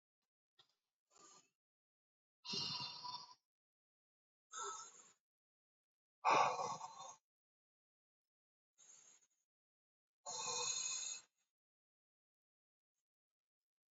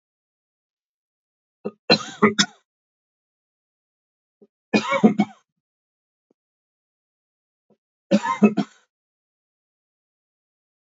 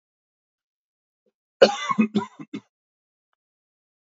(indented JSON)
{
  "exhalation_length": "13.9 s",
  "exhalation_amplitude": 3100,
  "exhalation_signal_mean_std_ratio": 0.3,
  "three_cough_length": "10.8 s",
  "three_cough_amplitude": 29480,
  "three_cough_signal_mean_std_ratio": 0.23,
  "cough_length": "4.1 s",
  "cough_amplitude": 29555,
  "cough_signal_mean_std_ratio": 0.22,
  "survey_phase": "beta (2021-08-13 to 2022-03-07)",
  "age": "45-64",
  "gender": "Male",
  "wearing_mask": "No",
  "symptom_cough_any": true,
  "symptom_onset": "7 days",
  "smoker_status": "Never smoked",
  "respiratory_condition_asthma": false,
  "respiratory_condition_other": false,
  "recruitment_source": "Test and Trace",
  "submission_delay": "1 day",
  "covid_test_result": "Positive",
  "covid_test_method": "RT-qPCR",
  "covid_ct_value": 21.2,
  "covid_ct_gene": "N gene"
}